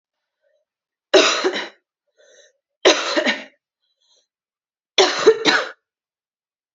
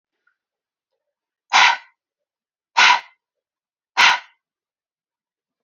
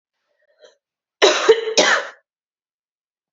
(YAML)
three_cough_length: 6.7 s
three_cough_amplitude: 29429
three_cough_signal_mean_std_ratio: 0.35
exhalation_length: 5.6 s
exhalation_amplitude: 32767
exhalation_signal_mean_std_ratio: 0.27
cough_length: 3.3 s
cough_amplitude: 28744
cough_signal_mean_std_ratio: 0.35
survey_phase: alpha (2021-03-01 to 2021-08-12)
age: 18-44
gender: Female
wearing_mask: 'No'
symptom_new_continuous_cough: true
symptom_fatigue: true
symptom_change_to_sense_of_smell_or_taste: true
symptom_loss_of_taste: true
symptom_onset: 6 days
smoker_status: Never smoked
respiratory_condition_asthma: false
respiratory_condition_other: false
recruitment_source: Test and Trace
submission_delay: 2 days
covid_test_result: Positive
covid_test_method: RT-qPCR